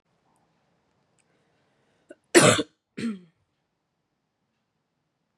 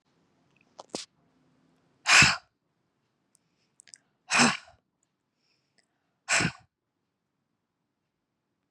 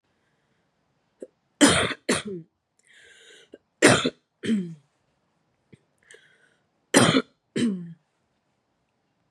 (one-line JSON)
{"cough_length": "5.4 s", "cough_amplitude": 25014, "cough_signal_mean_std_ratio": 0.19, "exhalation_length": "8.7 s", "exhalation_amplitude": 20019, "exhalation_signal_mean_std_ratio": 0.22, "three_cough_length": "9.3 s", "three_cough_amplitude": 24950, "three_cough_signal_mean_std_ratio": 0.3, "survey_phase": "beta (2021-08-13 to 2022-03-07)", "age": "18-44", "gender": "Female", "wearing_mask": "No", "symptom_cough_any": true, "symptom_sore_throat": true, "symptom_abdominal_pain": true, "symptom_fatigue": true, "symptom_headache": true, "smoker_status": "Never smoked", "respiratory_condition_asthma": false, "respiratory_condition_other": false, "recruitment_source": "Test and Trace", "submission_delay": "1 day", "covid_test_result": "Positive", "covid_test_method": "LFT"}